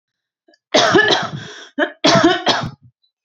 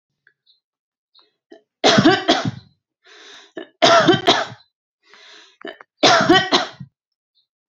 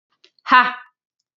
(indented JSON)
{
  "cough_length": "3.2 s",
  "cough_amplitude": 31833,
  "cough_signal_mean_std_ratio": 0.53,
  "three_cough_length": "7.7 s",
  "three_cough_amplitude": 31463,
  "three_cough_signal_mean_std_ratio": 0.39,
  "exhalation_length": "1.4 s",
  "exhalation_amplitude": 28038,
  "exhalation_signal_mean_std_ratio": 0.31,
  "survey_phase": "alpha (2021-03-01 to 2021-08-12)",
  "age": "18-44",
  "gender": "Female",
  "wearing_mask": "No",
  "symptom_none": true,
  "smoker_status": "Ex-smoker",
  "respiratory_condition_asthma": false,
  "respiratory_condition_other": false,
  "recruitment_source": "REACT",
  "submission_delay": "1 day",
  "covid_test_result": "Negative",
  "covid_test_method": "RT-qPCR"
}